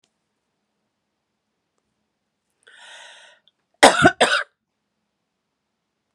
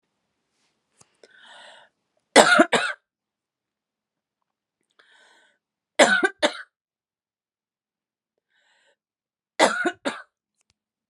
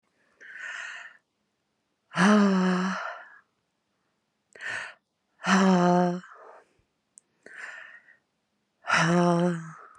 {"cough_length": "6.1 s", "cough_amplitude": 32768, "cough_signal_mean_std_ratio": 0.2, "three_cough_length": "11.1 s", "three_cough_amplitude": 32768, "three_cough_signal_mean_std_ratio": 0.23, "exhalation_length": "10.0 s", "exhalation_amplitude": 13483, "exhalation_signal_mean_std_ratio": 0.44, "survey_phase": "beta (2021-08-13 to 2022-03-07)", "age": "18-44", "gender": "Female", "wearing_mask": "No", "symptom_cough_any": true, "symptom_runny_or_blocked_nose": true, "symptom_onset": "12 days", "smoker_status": "Current smoker (11 or more cigarettes per day)", "respiratory_condition_asthma": false, "respiratory_condition_other": false, "recruitment_source": "REACT", "submission_delay": "2 days", "covid_test_result": "Negative", "covid_test_method": "RT-qPCR"}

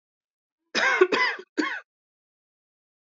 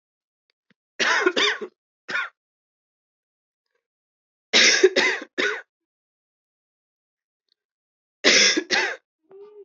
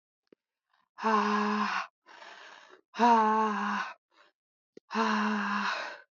{"cough_length": "3.2 s", "cough_amplitude": 16425, "cough_signal_mean_std_ratio": 0.38, "three_cough_length": "9.6 s", "three_cough_amplitude": 25880, "three_cough_signal_mean_std_ratio": 0.36, "exhalation_length": "6.1 s", "exhalation_amplitude": 8269, "exhalation_signal_mean_std_ratio": 0.58, "survey_phase": "beta (2021-08-13 to 2022-03-07)", "age": "18-44", "gender": "Female", "wearing_mask": "Yes", "symptom_cough_any": true, "symptom_runny_or_blocked_nose": true, "symptom_fatigue": true, "symptom_fever_high_temperature": true, "symptom_headache": true, "symptom_change_to_sense_of_smell_or_taste": true, "symptom_loss_of_taste": true, "symptom_other": true, "symptom_onset": "7 days", "smoker_status": "Never smoked", "respiratory_condition_asthma": false, "respiratory_condition_other": false, "recruitment_source": "Test and Trace", "submission_delay": "6 days", "covid_test_result": "Positive", "covid_test_method": "RT-qPCR", "covid_ct_value": 14.9, "covid_ct_gene": "ORF1ab gene", "covid_ct_mean": 15.3, "covid_viral_load": "9900000 copies/ml", "covid_viral_load_category": "High viral load (>1M copies/ml)"}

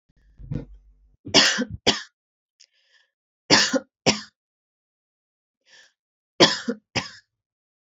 {"three_cough_length": "7.9 s", "three_cough_amplitude": 29842, "three_cough_signal_mean_std_ratio": 0.29, "survey_phase": "beta (2021-08-13 to 2022-03-07)", "age": "18-44", "gender": "Female", "wearing_mask": "No", "symptom_sore_throat": true, "smoker_status": "Never smoked", "respiratory_condition_asthma": false, "respiratory_condition_other": false, "recruitment_source": "Test and Trace", "submission_delay": "0 days", "covid_test_result": "Negative", "covid_test_method": "RT-qPCR"}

